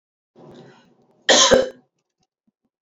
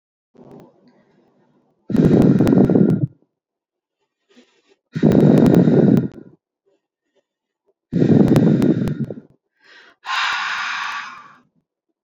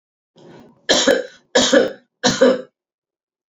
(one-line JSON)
{"cough_length": "2.8 s", "cough_amplitude": 27717, "cough_signal_mean_std_ratio": 0.3, "exhalation_length": "12.0 s", "exhalation_amplitude": 27675, "exhalation_signal_mean_std_ratio": 0.48, "three_cough_length": "3.5 s", "three_cough_amplitude": 30186, "three_cough_signal_mean_std_ratio": 0.44, "survey_phase": "beta (2021-08-13 to 2022-03-07)", "age": "18-44", "gender": "Female", "wearing_mask": "No", "symptom_none": true, "symptom_onset": "11 days", "smoker_status": "Ex-smoker", "respiratory_condition_asthma": false, "respiratory_condition_other": false, "recruitment_source": "REACT", "submission_delay": "4 days", "covid_test_result": "Negative", "covid_test_method": "RT-qPCR"}